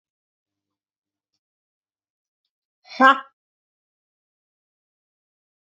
{"exhalation_length": "5.7 s", "exhalation_amplitude": 27520, "exhalation_signal_mean_std_ratio": 0.13, "survey_phase": "beta (2021-08-13 to 2022-03-07)", "age": "18-44", "gender": "Female", "wearing_mask": "No", "symptom_cough_any": true, "symptom_runny_or_blocked_nose": true, "symptom_sore_throat": true, "symptom_fatigue": true, "symptom_headache": true, "symptom_change_to_sense_of_smell_or_taste": true, "symptom_loss_of_taste": true, "symptom_onset": "2 days", "smoker_status": "Ex-smoker", "respiratory_condition_asthma": true, "respiratory_condition_other": false, "recruitment_source": "Test and Trace", "submission_delay": "2 days", "covid_test_result": "Positive", "covid_test_method": "RT-qPCR"}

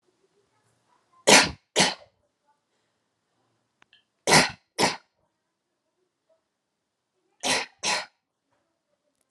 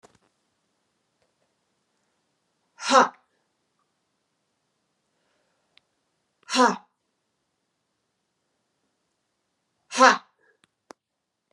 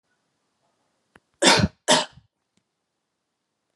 {"three_cough_length": "9.3 s", "three_cough_amplitude": 32091, "three_cough_signal_mean_std_ratio": 0.25, "exhalation_length": "11.5 s", "exhalation_amplitude": 27468, "exhalation_signal_mean_std_ratio": 0.17, "cough_length": "3.8 s", "cough_amplitude": 28395, "cough_signal_mean_std_ratio": 0.26, "survey_phase": "alpha (2021-03-01 to 2021-08-12)", "age": "18-44", "gender": "Female", "wearing_mask": "No", "symptom_none": true, "smoker_status": "Never smoked", "respiratory_condition_asthma": false, "respiratory_condition_other": false, "recruitment_source": "REACT", "submission_delay": "1 day", "covid_test_result": "Negative", "covid_test_method": "RT-qPCR"}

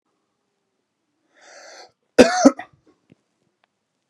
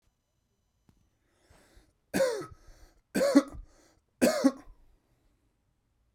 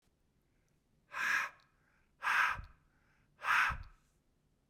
{"cough_length": "4.1 s", "cough_amplitude": 32768, "cough_signal_mean_std_ratio": 0.19, "three_cough_length": "6.1 s", "three_cough_amplitude": 12394, "three_cough_signal_mean_std_ratio": 0.3, "exhalation_length": "4.7 s", "exhalation_amplitude": 4238, "exhalation_signal_mean_std_ratio": 0.4, "survey_phase": "beta (2021-08-13 to 2022-03-07)", "age": "18-44", "gender": "Male", "wearing_mask": "No", "symptom_sore_throat": true, "symptom_abdominal_pain": true, "symptom_fatigue": true, "symptom_headache": true, "smoker_status": "Ex-smoker", "respiratory_condition_asthma": false, "respiratory_condition_other": false, "recruitment_source": "Test and Trace", "submission_delay": "1 day", "covid_test_result": "Negative", "covid_test_method": "RT-qPCR"}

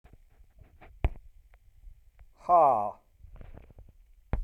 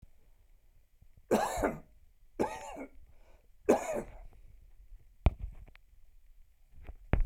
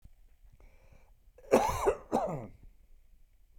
{"exhalation_length": "4.4 s", "exhalation_amplitude": 9218, "exhalation_signal_mean_std_ratio": 0.32, "three_cough_length": "7.3 s", "three_cough_amplitude": 10022, "three_cough_signal_mean_std_ratio": 0.36, "cough_length": "3.6 s", "cough_amplitude": 15541, "cough_signal_mean_std_ratio": 0.36, "survey_phase": "beta (2021-08-13 to 2022-03-07)", "age": "65+", "gender": "Male", "wearing_mask": "No", "symptom_none": true, "symptom_onset": "13 days", "smoker_status": "Never smoked", "respiratory_condition_asthma": false, "respiratory_condition_other": false, "recruitment_source": "REACT", "submission_delay": "0 days", "covid_test_result": "Negative", "covid_test_method": "RT-qPCR"}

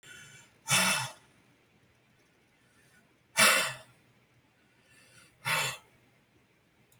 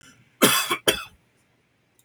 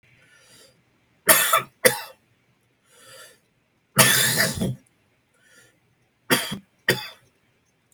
{"exhalation_length": "7.0 s", "exhalation_amplitude": 12908, "exhalation_signal_mean_std_ratio": 0.31, "cough_length": "2.0 s", "cough_amplitude": 30023, "cough_signal_mean_std_ratio": 0.35, "three_cough_length": "7.9 s", "three_cough_amplitude": 32768, "three_cough_signal_mean_std_ratio": 0.33, "survey_phase": "beta (2021-08-13 to 2022-03-07)", "age": "45-64", "gender": "Male", "wearing_mask": "No", "symptom_cough_any": true, "symptom_sore_throat": true, "symptom_fatigue": true, "smoker_status": "Ex-smoker", "respiratory_condition_asthma": false, "respiratory_condition_other": true, "recruitment_source": "REACT", "submission_delay": "2 days", "covid_test_result": "Negative", "covid_test_method": "RT-qPCR"}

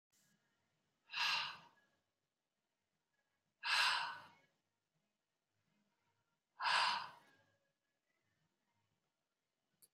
{"exhalation_length": "9.9 s", "exhalation_amplitude": 2808, "exhalation_signal_mean_std_ratio": 0.3, "survey_phase": "beta (2021-08-13 to 2022-03-07)", "age": "65+", "gender": "Male", "wearing_mask": "No", "symptom_cough_any": true, "symptom_sore_throat": true, "smoker_status": "Ex-smoker", "respiratory_condition_asthma": true, "respiratory_condition_other": false, "recruitment_source": "REACT", "submission_delay": "5 days", "covid_test_result": "Negative", "covid_test_method": "RT-qPCR", "influenza_a_test_result": "Negative", "influenza_b_test_result": "Negative"}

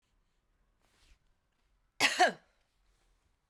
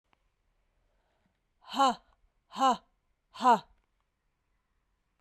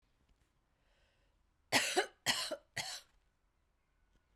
{"cough_length": "3.5 s", "cough_amplitude": 8174, "cough_signal_mean_std_ratio": 0.22, "exhalation_length": "5.2 s", "exhalation_amplitude": 8508, "exhalation_signal_mean_std_ratio": 0.25, "three_cough_length": "4.4 s", "three_cough_amplitude": 4665, "three_cough_signal_mean_std_ratio": 0.31, "survey_phase": "beta (2021-08-13 to 2022-03-07)", "age": "45-64", "gender": "Female", "wearing_mask": "No", "symptom_cough_any": true, "symptom_runny_or_blocked_nose": true, "symptom_shortness_of_breath": true, "symptom_fatigue": true, "symptom_headache": true, "symptom_onset": "6 days", "smoker_status": "Never smoked", "respiratory_condition_asthma": false, "respiratory_condition_other": false, "recruitment_source": "Test and Trace", "submission_delay": "1 day", "covid_test_result": "Positive", "covid_test_method": "RT-qPCR"}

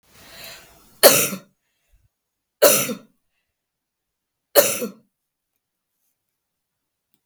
{"three_cough_length": "7.3 s", "three_cough_amplitude": 32768, "three_cough_signal_mean_std_ratio": 0.25, "survey_phase": "beta (2021-08-13 to 2022-03-07)", "age": "65+", "gender": "Female", "wearing_mask": "No", "symptom_none": true, "smoker_status": "Ex-smoker", "respiratory_condition_asthma": false, "respiratory_condition_other": false, "recruitment_source": "REACT", "submission_delay": "1 day", "covid_test_result": "Negative", "covid_test_method": "RT-qPCR"}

